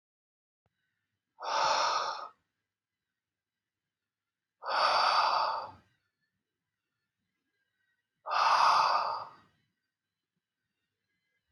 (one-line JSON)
{"exhalation_length": "11.5 s", "exhalation_amplitude": 7416, "exhalation_signal_mean_std_ratio": 0.39, "survey_phase": "beta (2021-08-13 to 2022-03-07)", "age": "18-44", "gender": "Male", "wearing_mask": "No", "symptom_none": true, "smoker_status": "Never smoked", "respiratory_condition_asthma": false, "respiratory_condition_other": false, "recruitment_source": "REACT", "submission_delay": "1 day", "covid_test_result": "Negative", "covid_test_method": "RT-qPCR"}